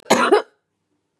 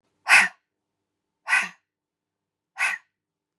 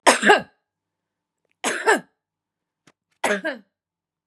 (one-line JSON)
{"cough_length": "1.2 s", "cough_amplitude": 29701, "cough_signal_mean_std_ratio": 0.4, "exhalation_length": "3.6 s", "exhalation_amplitude": 26802, "exhalation_signal_mean_std_ratio": 0.28, "three_cough_length": "4.3 s", "three_cough_amplitude": 32577, "three_cough_signal_mean_std_ratio": 0.31, "survey_phase": "beta (2021-08-13 to 2022-03-07)", "age": "45-64", "gender": "Female", "wearing_mask": "No", "symptom_none": true, "smoker_status": "Ex-smoker", "respiratory_condition_asthma": false, "respiratory_condition_other": false, "recruitment_source": "REACT", "submission_delay": "3 days", "covid_test_result": "Negative", "covid_test_method": "RT-qPCR", "influenza_a_test_result": "Negative", "influenza_b_test_result": "Negative"}